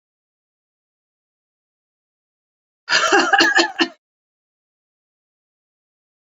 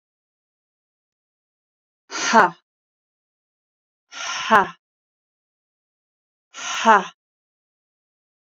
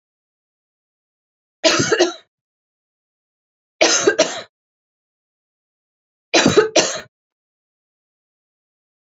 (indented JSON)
{
  "cough_length": "6.3 s",
  "cough_amplitude": 32767,
  "cough_signal_mean_std_ratio": 0.28,
  "exhalation_length": "8.4 s",
  "exhalation_amplitude": 32204,
  "exhalation_signal_mean_std_ratio": 0.23,
  "three_cough_length": "9.1 s",
  "three_cough_amplitude": 31488,
  "three_cough_signal_mean_std_ratio": 0.3,
  "survey_phase": "beta (2021-08-13 to 2022-03-07)",
  "age": "45-64",
  "gender": "Female",
  "wearing_mask": "No",
  "symptom_none": true,
  "smoker_status": "Ex-smoker",
  "respiratory_condition_asthma": false,
  "respiratory_condition_other": false,
  "recruitment_source": "REACT",
  "submission_delay": "3 days",
  "covid_test_result": "Negative",
  "covid_test_method": "RT-qPCR"
}